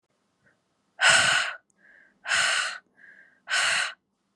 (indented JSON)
{
  "exhalation_length": "4.4 s",
  "exhalation_amplitude": 16740,
  "exhalation_signal_mean_std_ratio": 0.47,
  "survey_phase": "beta (2021-08-13 to 2022-03-07)",
  "age": "18-44",
  "gender": "Female",
  "wearing_mask": "No",
  "symptom_cough_any": true,
  "symptom_new_continuous_cough": true,
  "symptom_sore_throat": true,
  "symptom_headache": true,
  "symptom_other": true,
  "smoker_status": "Never smoked",
  "respiratory_condition_asthma": false,
  "respiratory_condition_other": false,
  "recruitment_source": "Test and Trace",
  "submission_delay": "-1 day",
  "covid_test_result": "Positive",
  "covid_test_method": "LFT"
}